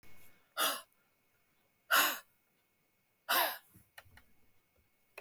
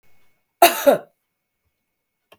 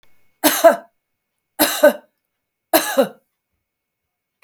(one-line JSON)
{"exhalation_length": "5.2 s", "exhalation_amplitude": 6993, "exhalation_signal_mean_std_ratio": 0.32, "cough_length": "2.4 s", "cough_amplitude": 32768, "cough_signal_mean_std_ratio": 0.25, "three_cough_length": "4.4 s", "three_cough_amplitude": 32768, "three_cough_signal_mean_std_ratio": 0.32, "survey_phase": "beta (2021-08-13 to 2022-03-07)", "age": "65+", "gender": "Female", "wearing_mask": "No", "symptom_none": true, "smoker_status": "Ex-smoker", "respiratory_condition_asthma": false, "respiratory_condition_other": false, "recruitment_source": "REACT", "submission_delay": "4 days", "covid_test_result": "Negative", "covid_test_method": "RT-qPCR", "influenza_a_test_result": "Negative", "influenza_b_test_result": "Negative"}